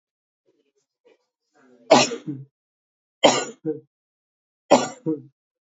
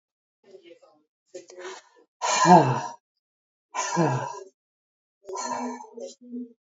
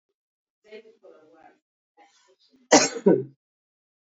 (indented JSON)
{
  "three_cough_length": "5.7 s",
  "three_cough_amplitude": 27165,
  "three_cough_signal_mean_std_ratio": 0.27,
  "exhalation_length": "6.7 s",
  "exhalation_amplitude": 26347,
  "exhalation_signal_mean_std_ratio": 0.35,
  "cough_length": "4.0 s",
  "cough_amplitude": 27277,
  "cough_signal_mean_std_ratio": 0.23,
  "survey_phase": "beta (2021-08-13 to 2022-03-07)",
  "age": "65+",
  "gender": "Female",
  "wearing_mask": "Yes",
  "symptom_cough_any": true,
  "smoker_status": "Ex-smoker",
  "respiratory_condition_asthma": false,
  "respiratory_condition_other": false,
  "recruitment_source": "REACT",
  "submission_delay": "2 days",
  "covid_test_result": "Negative",
  "covid_test_method": "RT-qPCR",
  "influenza_a_test_result": "Unknown/Void",
  "influenza_b_test_result": "Unknown/Void"
}